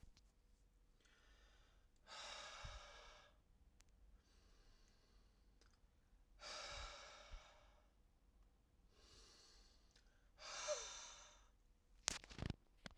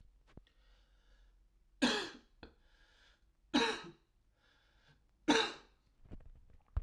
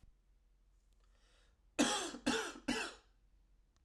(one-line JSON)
{"exhalation_length": "13.0 s", "exhalation_amplitude": 7313, "exhalation_signal_mean_std_ratio": 0.47, "three_cough_length": "6.8 s", "three_cough_amplitude": 5416, "three_cough_signal_mean_std_ratio": 0.3, "cough_length": "3.8 s", "cough_amplitude": 4007, "cough_signal_mean_std_ratio": 0.39, "survey_phase": "alpha (2021-03-01 to 2021-08-12)", "age": "18-44", "gender": "Male", "wearing_mask": "No", "symptom_cough_any": true, "smoker_status": "Ex-smoker", "respiratory_condition_asthma": false, "respiratory_condition_other": false, "recruitment_source": "Test and Trace", "submission_delay": "2 days", "covid_test_result": "Positive", "covid_test_method": "RT-qPCR", "covid_ct_value": 15.0, "covid_ct_gene": "S gene", "covid_ct_mean": 15.0, "covid_viral_load": "12000000 copies/ml", "covid_viral_load_category": "High viral load (>1M copies/ml)"}